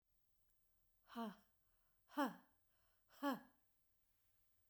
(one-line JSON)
{"exhalation_length": "4.7 s", "exhalation_amplitude": 1295, "exhalation_signal_mean_std_ratio": 0.28, "survey_phase": "beta (2021-08-13 to 2022-03-07)", "age": "45-64", "gender": "Female", "wearing_mask": "No", "symptom_none": true, "smoker_status": "Never smoked", "respiratory_condition_asthma": false, "respiratory_condition_other": false, "recruitment_source": "REACT", "submission_delay": "2 days", "covid_test_result": "Negative", "covid_test_method": "RT-qPCR"}